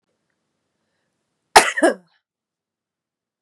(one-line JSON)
{"cough_length": "3.4 s", "cough_amplitude": 32768, "cough_signal_mean_std_ratio": 0.2, "survey_phase": "beta (2021-08-13 to 2022-03-07)", "age": "18-44", "gender": "Female", "wearing_mask": "No", "symptom_cough_any": true, "symptom_runny_or_blocked_nose": true, "smoker_status": "Ex-smoker", "respiratory_condition_asthma": false, "respiratory_condition_other": false, "recruitment_source": "Test and Trace", "submission_delay": "2 days", "covid_test_result": "Negative", "covid_test_method": "RT-qPCR"}